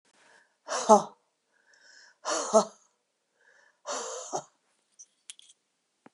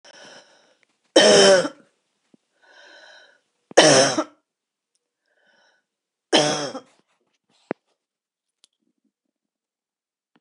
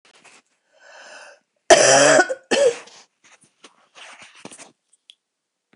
{"exhalation_length": "6.1 s", "exhalation_amplitude": 19139, "exhalation_signal_mean_std_ratio": 0.25, "three_cough_length": "10.4 s", "three_cough_amplitude": 27249, "three_cough_signal_mean_std_ratio": 0.27, "cough_length": "5.8 s", "cough_amplitude": 29459, "cough_signal_mean_std_ratio": 0.32, "survey_phase": "alpha (2021-03-01 to 2021-08-12)", "age": "65+", "gender": "Female", "wearing_mask": "No", "symptom_none": true, "smoker_status": "Ex-smoker", "respiratory_condition_asthma": false, "respiratory_condition_other": false, "recruitment_source": "REACT", "submission_delay": "2 days", "covid_test_result": "Negative", "covid_test_method": "RT-qPCR"}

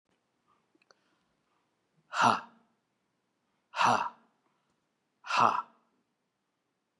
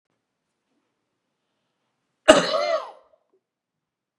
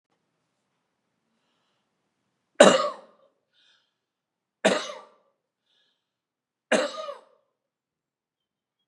{"exhalation_length": "7.0 s", "exhalation_amplitude": 11730, "exhalation_signal_mean_std_ratio": 0.27, "cough_length": "4.2 s", "cough_amplitude": 32768, "cough_signal_mean_std_ratio": 0.22, "three_cough_length": "8.9 s", "three_cough_amplitude": 32750, "three_cough_signal_mean_std_ratio": 0.19, "survey_phase": "beta (2021-08-13 to 2022-03-07)", "age": "45-64", "gender": "Male", "wearing_mask": "No", "symptom_none": true, "smoker_status": "Never smoked", "respiratory_condition_asthma": true, "respiratory_condition_other": false, "recruitment_source": "REACT", "submission_delay": "4 days", "covid_test_result": "Negative", "covid_test_method": "RT-qPCR", "influenza_a_test_result": "Negative", "influenza_b_test_result": "Negative"}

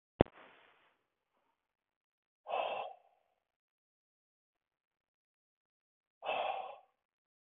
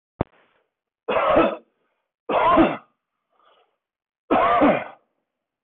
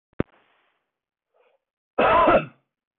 {"exhalation_length": "7.4 s", "exhalation_amplitude": 12415, "exhalation_signal_mean_std_ratio": 0.21, "three_cough_length": "5.6 s", "three_cough_amplitude": 15974, "three_cough_signal_mean_std_ratio": 0.43, "cough_length": "3.0 s", "cough_amplitude": 14854, "cough_signal_mean_std_ratio": 0.34, "survey_phase": "beta (2021-08-13 to 2022-03-07)", "age": "45-64", "gender": "Male", "wearing_mask": "No", "symptom_none": true, "smoker_status": "Ex-smoker", "respiratory_condition_asthma": false, "respiratory_condition_other": false, "recruitment_source": "REACT", "submission_delay": "1 day", "covid_test_result": "Negative", "covid_test_method": "RT-qPCR"}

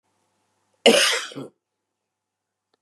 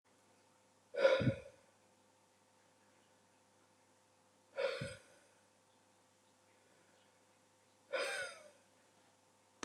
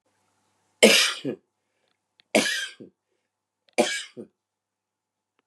{"cough_length": "2.8 s", "cough_amplitude": 29146, "cough_signal_mean_std_ratio": 0.28, "exhalation_length": "9.6 s", "exhalation_amplitude": 4226, "exhalation_signal_mean_std_ratio": 0.28, "three_cough_length": "5.5 s", "three_cough_amplitude": 31016, "three_cough_signal_mean_std_ratio": 0.29, "survey_phase": "beta (2021-08-13 to 2022-03-07)", "age": "45-64", "gender": "Male", "wearing_mask": "No", "symptom_sore_throat": true, "symptom_fatigue": true, "symptom_headache": true, "symptom_onset": "3 days", "smoker_status": "Ex-smoker", "respiratory_condition_asthma": true, "respiratory_condition_other": false, "recruitment_source": "Test and Trace", "submission_delay": "2 days", "covid_test_result": "Positive", "covid_test_method": "RT-qPCR", "covid_ct_value": 22.5, "covid_ct_gene": "ORF1ab gene"}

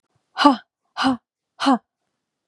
{"exhalation_length": "2.5 s", "exhalation_amplitude": 32755, "exhalation_signal_mean_std_ratio": 0.33, "survey_phase": "beta (2021-08-13 to 2022-03-07)", "age": "45-64", "gender": "Female", "wearing_mask": "No", "symptom_cough_any": true, "symptom_fatigue": true, "symptom_headache": true, "symptom_onset": "4 days", "smoker_status": "Never smoked", "respiratory_condition_asthma": false, "respiratory_condition_other": false, "recruitment_source": "Test and Trace", "submission_delay": "2 days", "covid_test_result": "Positive", "covid_test_method": "RT-qPCR", "covid_ct_value": 24.9, "covid_ct_gene": "ORF1ab gene"}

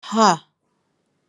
{"exhalation_length": "1.3 s", "exhalation_amplitude": 29939, "exhalation_signal_mean_std_ratio": 0.33, "survey_phase": "alpha (2021-03-01 to 2021-08-12)", "age": "45-64", "gender": "Female", "wearing_mask": "No", "symptom_none": true, "smoker_status": "Never smoked", "respiratory_condition_asthma": false, "respiratory_condition_other": false, "recruitment_source": "REACT", "submission_delay": "1 day", "covid_test_result": "Negative", "covid_test_method": "RT-qPCR"}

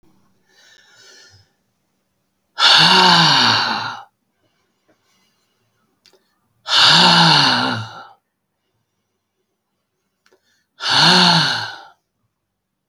{"exhalation_length": "12.9 s", "exhalation_amplitude": 32768, "exhalation_signal_mean_std_ratio": 0.42, "survey_phase": "beta (2021-08-13 to 2022-03-07)", "age": "45-64", "gender": "Male", "wearing_mask": "No", "symptom_none": true, "smoker_status": "Never smoked", "respiratory_condition_asthma": false, "respiratory_condition_other": false, "recruitment_source": "REACT", "submission_delay": "3 days", "covid_test_result": "Negative", "covid_test_method": "RT-qPCR", "influenza_a_test_result": "Negative", "influenza_b_test_result": "Negative"}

